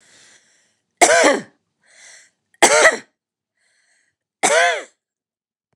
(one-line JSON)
{"three_cough_length": "5.8 s", "three_cough_amplitude": 29204, "three_cough_signal_mean_std_ratio": 0.34, "survey_phase": "beta (2021-08-13 to 2022-03-07)", "age": "45-64", "gender": "Female", "wearing_mask": "No", "symptom_none": true, "smoker_status": "Never smoked", "respiratory_condition_asthma": true, "respiratory_condition_other": false, "recruitment_source": "REACT", "submission_delay": "1 day", "covid_test_result": "Negative", "covid_test_method": "RT-qPCR", "influenza_a_test_result": "Negative", "influenza_b_test_result": "Negative"}